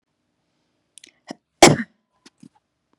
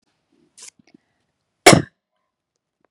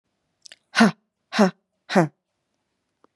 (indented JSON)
{
  "cough_length": "3.0 s",
  "cough_amplitude": 32768,
  "cough_signal_mean_std_ratio": 0.17,
  "three_cough_length": "2.9 s",
  "three_cough_amplitude": 32768,
  "three_cough_signal_mean_std_ratio": 0.17,
  "exhalation_length": "3.2 s",
  "exhalation_amplitude": 28049,
  "exhalation_signal_mean_std_ratio": 0.28,
  "survey_phase": "beta (2021-08-13 to 2022-03-07)",
  "age": "18-44",
  "gender": "Female",
  "wearing_mask": "No",
  "symptom_none": true,
  "smoker_status": "Ex-smoker",
  "respiratory_condition_asthma": false,
  "respiratory_condition_other": false,
  "recruitment_source": "REACT",
  "submission_delay": "1 day",
  "covid_test_result": "Negative",
  "covid_test_method": "RT-qPCR",
  "influenza_a_test_result": "Negative",
  "influenza_b_test_result": "Negative"
}